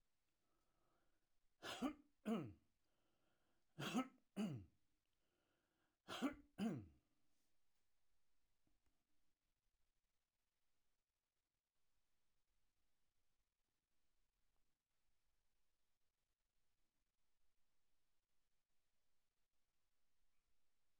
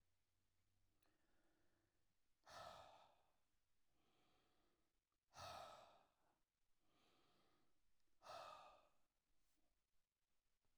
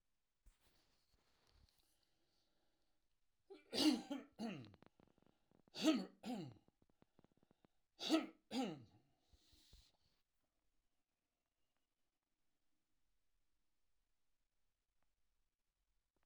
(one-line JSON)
{"three_cough_length": "21.0 s", "three_cough_amplitude": 753, "three_cough_signal_mean_std_ratio": 0.25, "exhalation_length": "10.8 s", "exhalation_amplitude": 183, "exhalation_signal_mean_std_ratio": 0.46, "cough_length": "16.3 s", "cough_amplitude": 2365, "cough_signal_mean_std_ratio": 0.24, "survey_phase": "alpha (2021-03-01 to 2021-08-12)", "age": "65+", "gender": "Male", "wearing_mask": "No", "symptom_none": true, "smoker_status": "Ex-smoker", "respiratory_condition_asthma": false, "respiratory_condition_other": false, "recruitment_source": "REACT", "submission_delay": "1 day", "covid_test_result": "Negative", "covid_test_method": "RT-qPCR"}